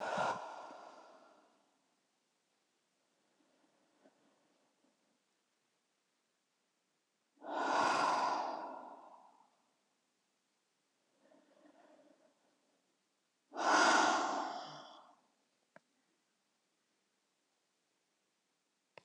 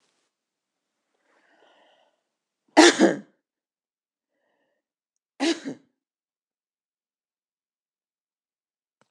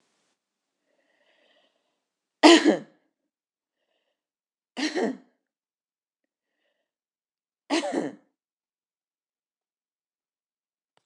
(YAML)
exhalation_length: 19.0 s
exhalation_amplitude: 4602
exhalation_signal_mean_std_ratio: 0.31
cough_length: 9.1 s
cough_amplitude: 26027
cough_signal_mean_std_ratio: 0.17
three_cough_length: 11.1 s
three_cough_amplitude: 25323
three_cough_signal_mean_std_ratio: 0.19
survey_phase: beta (2021-08-13 to 2022-03-07)
age: 65+
gender: Female
wearing_mask: 'No'
symptom_none: true
smoker_status: Ex-smoker
respiratory_condition_asthma: false
respiratory_condition_other: true
recruitment_source: REACT
submission_delay: 2 days
covid_test_result: Negative
covid_test_method: RT-qPCR
influenza_a_test_result: Negative
influenza_b_test_result: Negative